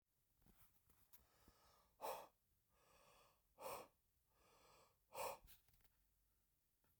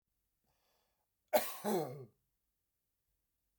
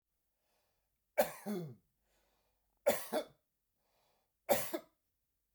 {"exhalation_length": "7.0 s", "exhalation_amplitude": 516, "exhalation_signal_mean_std_ratio": 0.35, "cough_length": "3.6 s", "cough_amplitude": 4638, "cough_signal_mean_std_ratio": 0.28, "three_cough_length": "5.5 s", "three_cough_amplitude": 4723, "three_cough_signal_mean_std_ratio": 0.29, "survey_phase": "beta (2021-08-13 to 2022-03-07)", "age": "18-44", "gender": "Male", "wearing_mask": "No", "symptom_none": true, "smoker_status": "Ex-smoker", "respiratory_condition_asthma": false, "respiratory_condition_other": false, "recruitment_source": "REACT", "submission_delay": "2 days", "covid_test_result": "Negative", "covid_test_method": "RT-qPCR"}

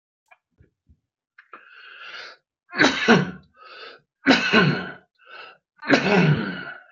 {"three_cough_length": "6.9 s", "three_cough_amplitude": 26832, "three_cough_signal_mean_std_ratio": 0.42, "survey_phase": "beta (2021-08-13 to 2022-03-07)", "age": "45-64", "gender": "Male", "wearing_mask": "No", "symptom_abdominal_pain": true, "symptom_onset": "12 days", "smoker_status": "Ex-smoker", "respiratory_condition_asthma": false, "respiratory_condition_other": true, "recruitment_source": "REACT", "submission_delay": "2 days", "covid_test_result": "Negative", "covid_test_method": "RT-qPCR"}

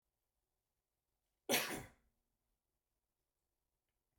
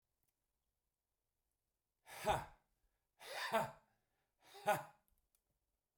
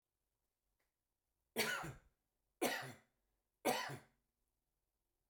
{"cough_length": "4.2 s", "cough_amplitude": 3042, "cough_signal_mean_std_ratio": 0.2, "exhalation_length": "6.0 s", "exhalation_amplitude": 2336, "exhalation_signal_mean_std_ratio": 0.28, "three_cough_length": "5.3 s", "three_cough_amplitude": 2367, "three_cough_signal_mean_std_ratio": 0.32, "survey_phase": "beta (2021-08-13 to 2022-03-07)", "age": "45-64", "gender": "Male", "wearing_mask": "No", "symptom_none": true, "smoker_status": "Current smoker (1 to 10 cigarettes per day)", "respiratory_condition_asthma": false, "respiratory_condition_other": false, "recruitment_source": "REACT", "submission_delay": "3 days", "covid_test_result": "Negative", "covid_test_method": "RT-qPCR"}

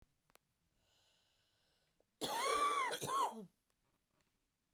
{"cough_length": "4.7 s", "cough_amplitude": 1714, "cough_signal_mean_std_ratio": 0.42, "survey_phase": "beta (2021-08-13 to 2022-03-07)", "age": "45-64", "gender": "Female", "wearing_mask": "No", "symptom_cough_any": true, "symptom_fatigue": true, "symptom_fever_high_temperature": true, "symptom_onset": "3 days", "smoker_status": "Ex-smoker", "respiratory_condition_asthma": false, "respiratory_condition_other": false, "recruitment_source": "Test and Trace", "submission_delay": "2 days", "covid_test_result": "Positive", "covid_test_method": "RT-qPCR"}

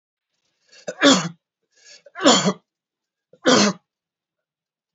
{"three_cough_length": "4.9 s", "three_cough_amplitude": 28814, "three_cough_signal_mean_std_ratio": 0.33, "survey_phase": "beta (2021-08-13 to 2022-03-07)", "age": "65+", "gender": "Male", "wearing_mask": "No", "symptom_runny_or_blocked_nose": true, "smoker_status": "Ex-smoker", "respiratory_condition_asthma": false, "respiratory_condition_other": false, "recruitment_source": "REACT", "submission_delay": "1 day", "covid_test_result": "Negative", "covid_test_method": "RT-qPCR", "influenza_a_test_result": "Negative", "influenza_b_test_result": "Negative"}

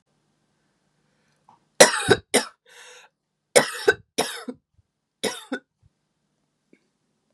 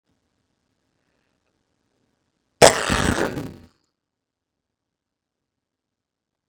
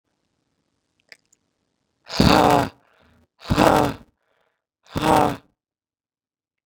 {"three_cough_length": "7.3 s", "three_cough_amplitude": 32768, "three_cough_signal_mean_std_ratio": 0.23, "cough_length": "6.5 s", "cough_amplitude": 32768, "cough_signal_mean_std_ratio": 0.16, "exhalation_length": "6.7 s", "exhalation_amplitude": 32694, "exhalation_signal_mean_std_ratio": 0.26, "survey_phase": "beta (2021-08-13 to 2022-03-07)", "age": "18-44", "gender": "Female", "wearing_mask": "No", "symptom_cough_any": true, "symptom_runny_or_blocked_nose": true, "symptom_shortness_of_breath": true, "symptom_sore_throat": true, "symptom_fatigue": true, "symptom_headache": true, "symptom_other": true, "symptom_onset": "3 days", "smoker_status": "Never smoked", "respiratory_condition_asthma": true, "respiratory_condition_other": false, "recruitment_source": "Test and Trace", "submission_delay": "1 day", "covid_test_result": "Positive", "covid_test_method": "RT-qPCR"}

